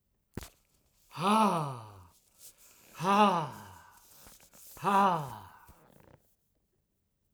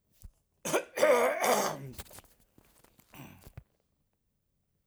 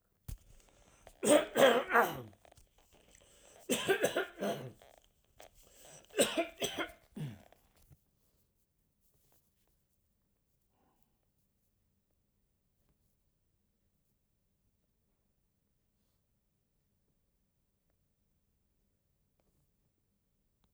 exhalation_length: 7.3 s
exhalation_amplitude: 7808
exhalation_signal_mean_std_ratio: 0.4
cough_length: 4.9 s
cough_amplitude: 8109
cough_signal_mean_std_ratio: 0.38
three_cough_length: 20.7 s
three_cough_amplitude: 8472
three_cough_signal_mean_std_ratio: 0.24
survey_phase: alpha (2021-03-01 to 2021-08-12)
age: 65+
gender: Male
wearing_mask: 'No'
symptom_none: true
smoker_status: Never smoked
respiratory_condition_asthma: false
respiratory_condition_other: false
recruitment_source: REACT
submission_delay: 1 day
covid_test_method: RT-qPCR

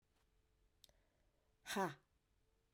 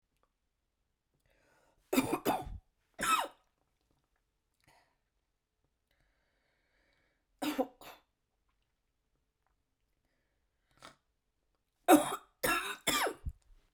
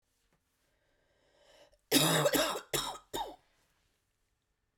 exhalation_length: 2.7 s
exhalation_amplitude: 1270
exhalation_signal_mean_std_ratio: 0.25
three_cough_length: 13.7 s
three_cough_amplitude: 9609
three_cough_signal_mean_std_ratio: 0.25
cough_length: 4.8 s
cough_amplitude: 8312
cough_signal_mean_std_ratio: 0.36
survey_phase: beta (2021-08-13 to 2022-03-07)
age: 18-44
gender: Female
wearing_mask: 'No'
symptom_cough_any: true
symptom_runny_or_blocked_nose: true
symptom_change_to_sense_of_smell_or_taste: true
symptom_other: true
smoker_status: Never smoked
respiratory_condition_asthma: false
respiratory_condition_other: false
recruitment_source: Test and Trace
submission_delay: 2 days
covid_test_result: Positive
covid_test_method: RT-qPCR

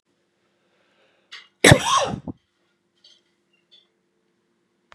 cough_length: 4.9 s
cough_amplitude: 32768
cough_signal_mean_std_ratio: 0.21
survey_phase: beta (2021-08-13 to 2022-03-07)
age: 45-64
gender: Male
wearing_mask: 'No'
symptom_cough_any: true
symptom_runny_or_blocked_nose: true
symptom_diarrhoea: true
symptom_fatigue: true
symptom_onset: 3 days
smoker_status: Current smoker (e-cigarettes or vapes only)
respiratory_condition_asthma: false
respiratory_condition_other: false
recruitment_source: Test and Trace
submission_delay: 2 days
covid_test_result: Positive
covid_test_method: RT-qPCR
covid_ct_value: 19.1
covid_ct_gene: ORF1ab gene
covid_ct_mean: 19.7
covid_viral_load: 360000 copies/ml
covid_viral_load_category: Low viral load (10K-1M copies/ml)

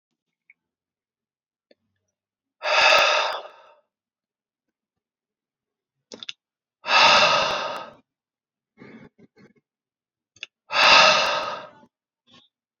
exhalation_length: 12.8 s
exhalation_amplitude: 28703
exhalation_signal_mean_std_ratio: 0.34
survey_phase: alpha (2021-03-01 to 2021-08-12)
age: 18-44
gender: Male
wearing_mask: 'No'
symptom_none: true
smoker_status: Ex-smoker
respiratory_condition_asthma: false
respiratory_condition_other: false
recruitment_source: REACT
submission_delay: 1 day
covid_test_result: Negative
covid_test_method: RT-qPCR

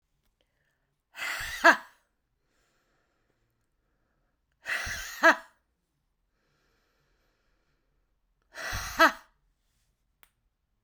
exhalation_length: 10.8 s
exhalation_amplitude: 18506
exhalation_signal_mean_std_ratio: 0.21
survey_phase: beta (2021-08-13 to 2022-03-07)
age: 45-64
gender: Female
wearing_mask: 'No'
symptom_none: true
smoker_status: Never smoked
respiratory_condition_asthma: false
respiratory_condition_other: false
recruitment_source: REACT
submission_delay: 1 day
covid_test_result: Negative
covid_test_method: RT-qPCR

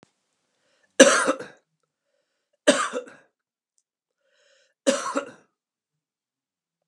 three_cough_length: 6.9 s
three_cough_amplitude: 32706
three_cough_signal_mean_std_ratio: 0.24
survey_phase: beta (2021-08-13 to 2022-03-07)
age: 45-64
gender: Male
wearing_mask: 'No'
symptom_change_to_sense_of_smell_or_taste: true
symptom_loss_of_taste: true
smoker_status: Ex-smoker
respiratory_condition_asthma: false
respiratory_condition_other: false
recruitment_source: REACT
submission_delay: 2 days
covid_test_result: Negative
covid_test_method: RT-qPCR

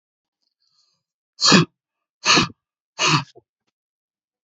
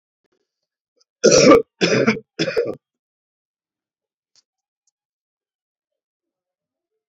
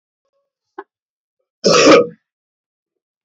exhalation_length: 4.4 s
exhalation_amplitude: 29161
exhalation_signal_mean_std_ratio: 0.3
three_cough_length: 7.1 s
three_cough_amplitude: 29039
three_cough_signal_mean_std_ratio: 0.27
cough_length: 3.2 s
cough_amplitude: 30232
cough_signal_mean_std_ratio: 0.3
survey_phase: beta (2021-08-13 to 2022-03-07)
age: 65+
gender: Male
wearing_mask: 'No'
symptom_cough_any: true
smoker_status: Ex-smoker
respiratory_condition_asthma: false
respiratory_condition_other: false
recruitment_source: REACT
submission_delay: 3 days
covid_test_result: Negative
covid_test_method: RT-qPCR
influenza_a_test_result: Negative
influenza_b_test_result: Negative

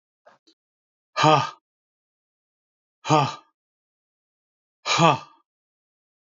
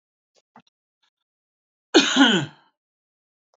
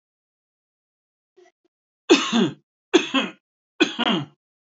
exhalation_length: 6.4 s
exhalation_amplitude: 26696
exhalation_signal_mean_std_ratio: 0.27
cough_length: 3.6 s
cough_amplitude: 26489
cough_signal_mean_std_ratio: 0.28
three_cough_length: 4.8 s
three_cough_amplitude: 26575
three_cough_signal_mean_std_ratio: 0.33
survey_phase: beta (2021-08-13 to 2022-03-07)
age: 45-64
gender: Male
wearing_mask: 'No'
symptom_runny_or_blocked_nose: true
symptom_onset: 7 days
smoker_status: Never smoked
respiratory_condition_asthma: false
respiratory_condition_other: false
recruitment_source: REACT
submission_delay: 1 day
covid_test_result: Negative
covid_test_method: RT-qPCR
influenza_a_test_result: Negative
influenza_b_test_result: Negative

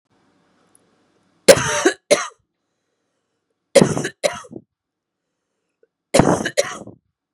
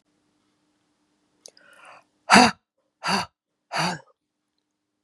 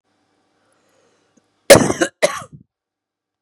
three_cough_length: 7.3 s
three_cough_amplitude: 32768
three_cough_signal_mean_std_ratio: 0.29
exhalation_length: 5.0 s
exhalation_amplitude: 32674
exhalation_signal_mean_std_ratio: 0.24
cough_length: 3.4 s
cough_amplitude: 32768
cough_signal_mean_std_ratio: 0.23
survey_phase: beta (2021-08-13 to 2022-03-07)
age: 45-64
gender: Female
wearing_mask: 'No'
symptom_none: true
smoker_status: Current smoker (1 to 10 cigarettes per day)
respiratory_condition_asthma: false
respiratory_condition_other: false
recruitment_source: REACT
submission_delay: 3 days
covid_test_result: Negative
covid_test_method: RT-qPCR
influenza_a_test_result: Negative
influenza_b_test_result: Negative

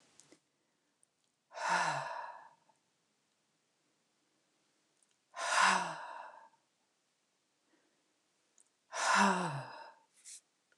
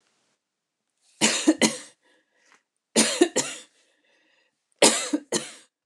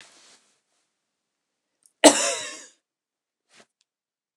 exhalation_length: 10.8 s
exhalation_amplitude: 5682
exhalation_signal_mean_std_ratio: 0.34
three_cough_length: 5.9 s
three_cough_amplitude: 28671
three_cough_signal_mean_std_ratio: 0.34
cough_length: 4.4 s
cough_amplitude: 29204
cough_signal_mean_std_ratio: 0.18
survey_phase: alpha (2021-03-01 to 2021-08-12)
age: 45-64
gender: Female
wearing_mask: 'No'
symptom_none: true
smoker_status: Never smoked
respiratory_condition_asthma: false
respiratory_condition_other: false
recruitment_source: REACT
submission_delay: 2 days
covid_test_result: Negative
covid_test_method: RT-qPCR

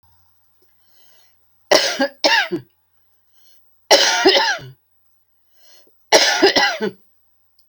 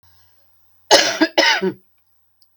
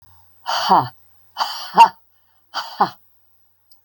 three_cough_length: 7.7 s
three_cough_amplitude: 32767
three_cough_signal_mean_std_ratio: 0.4
cough_length: 2.6 s
cough_amplitude: 32768
cough_signal_mean_std_ratio: 0.39
exhalation_length: 3.8 s
exhalation_amplitude: 32467
exhalation_signal_mean_std_ratio: 0.32
survey_phase: beta (2021-08-13 to 2022-03-07)
age: 65+
gender: Female
wearing_mask: 'No'
symptom_none: true
symptom_onset: 12 days
smoker_status: Never smoked
respiratory_condition_asthma: false
respiratory_condition_other: false
recruitment_source: REACT
submission_delay: 0 days
covid_test_result: Negative
covid_test_method: RT-qPCR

